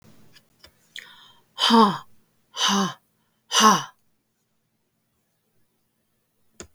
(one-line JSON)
{"exhalation_length": "6.7 s", "exhalation_amplitude": 29732, "exhalation_signal_mean_std_ratio": 0.3, "survey_phase": "beta (2021-08-13 to 2022-03-07)", "age": "45-64", "gender": "Female", "wearing_mask": "No", "symptom_none": true, "smoker_status": "Never smoked", "respiratory_condition_asthma": false, "respiratory_condition_other": false, "recruitment_source": "REACT", "submission_delay": "1 day", "covid_test_result": "Negative", "covid_test_method": "RT-qPCR", "influenza_a_test_result": "Negative", "influenza_b_test_result": "Negative"}